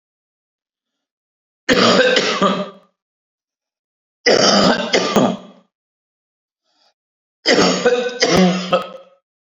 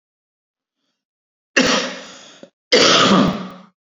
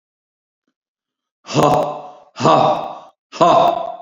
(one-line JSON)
{"three_cough_length": "9.5 s", "three_cough_amplitude": 32701, "three_cough_signal_mean_std_ratio": 0.49, "cough_length": "3.9 s", "cough_amplitude": 31125, "cough_signal_mean_std_ratio": 0.43, "exhalation_length": "4.0 s", "exhalation_amplitude": 32767, "exhalation_signal_mean_std_ratio": 0.5, "survey_phase": "beta (2021-08-13 to 2022-03-07)", "age": "45-64", "gender": "Male", "wearing_mask": "No", "symptom_cough_any": true, "symptom_sore_throat": true, "symptom_fatigue": true, "symptom_fever_high_temperature": true, "symptom_headache": true, "symptom_onset": "3 days", "smoker_status": "Never smoked", "respiratory_condition_asthma": false, "respiratory_condition_other": false, "recruitment_source": "Test and Trace", "submission_delay": "1 day", "covid_test_result": "Positive", "covid_test_method": "ePCR"}